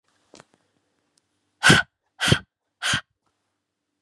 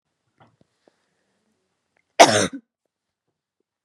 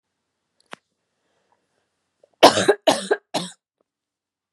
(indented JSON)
{
  "exhalation_length": "4.0 s",
  "exhalation_amplitude": 30316,
  "exhalation_signal_mean_std_ratio": 0.26,
  "cough_length": "3.8 s",
  "cough_amplitude": 32768,
  "cough_signal_mean_std_ratio": 0.18,
  "three_cough_length": "4.5 s",
  "three_cough_amplitude": 32768,
  "three_cough_signal_mean_std_ratio": 0.23,
  "survey_phase": "beta (2021-08-13 to 2022-03-07)",
  "age": "18-44",
  "gender": "Female",
  "wearing_mask": "No",
  "symptom_cough_any": true,
  "symptom_new_continuous_cough": true,
  "symptom_runny_or_blocked_nose": true,
  "symptom_shortness_of_breath": true,
  "smoker_status": "Never smoked",
  "respiratory_condition_asthma": false,
  "respiratory_condition_other": false,
  "recruitment_source": "Test and Trace",
  "submission_delay": "6 days",
  "covid_test_result": "Positive",
  "covid_test_method": "ePCR"
}